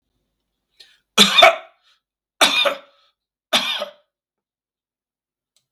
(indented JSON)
{
  "three_cough_length": "5.7 s",
  "three_cough_amplitude": 32768,
  "three_cough_signal_mean_std_ratio": 0.29,
  "survey_phase": "beta (2021-08-13 to 2022-03-07)",
  "age": "65+",
  "gender": "Male",
  "wearing_mask": "No",
  "symptom_none": true,
  "smoker_status": "Ex-smoker",
  "respiratory_condition_asthma": false,
  "respiratory_condition_other": false,
  "recruitment_source": "REACT",
  "submission_delay": "1 day",
  "covid_test_result": "Negative",
  "covid_test_method": "RT-qPCR",
  "influenza_a_test_result": "Negative",
  "influenza_b_test_result": "Negative"
}